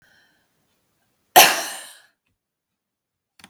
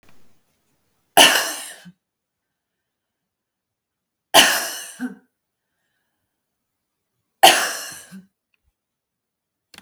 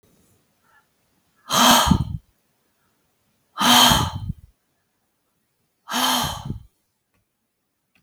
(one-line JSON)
{"cough_length": "3.5 s", "cough_amplitude": 32768, "cough_signal_mean_std_ratio": 0.2, "three_cough_length": "9.8 s", "three_cough_amplitude": 32768, "three_cough_signal_mean_std_ratio": 0.24, "exhalation_length": "8.0 s", "exhalation_amplitude": 32381, "exhalation_signal_mean_std_ratio": 0.35, "survey_phase": "beta (2021-08-13 to 2022-03-07)", "age": "65+", "gender": "Female", "wearing_mask": "No", "symptom_runny_or_blocked_nose": true, "symptom_shortness_of_breath": true, "symptom_fatigue": true, "symptom_onset": "12 days", "smoker_status": "Ex-smoker", "respiratory_condition_asthma": false, "respiratory_condition_other": false, "recruitment_source": "REACT", "submission_delay": "5 days", "covid_test_result": "Negative", "covid_test_method": "RT-qPCR"}